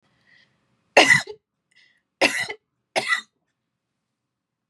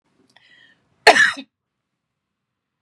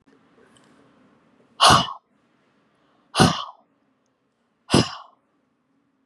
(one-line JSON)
{"three_cough_length": "4.7 s", "three_cough_amplitude": 30672, "three_cough_signal_mean_std_ratio": 0.27, "cough_length": "2.8 s", "cough_amplitude": 32768, "cough_signal_mean_std_ratio": 0.23, "exhalation_length": "6.1 s", "exhalation_amplitude": 28645, "exhalation_signal_mean_std_ratio": 0.25, "survey_phase": "beta (2021-08-13 to 2022-03-07)", "age": "45-64", "gender": "Female", "wearing_mask": "No", "symptom_none": true, "smoker_status": "Never smoked", "respiratory_condition_asthma": false, "respiratory_condition_other": false, "recruitment_source": "REACT", "submission_delay": "1 day", "covid_test_result": "Negative", "covid_test_method": "RT-qPCR", "influenza_a_test_result": "Negative", "influenza_b_test_result": "Negative"}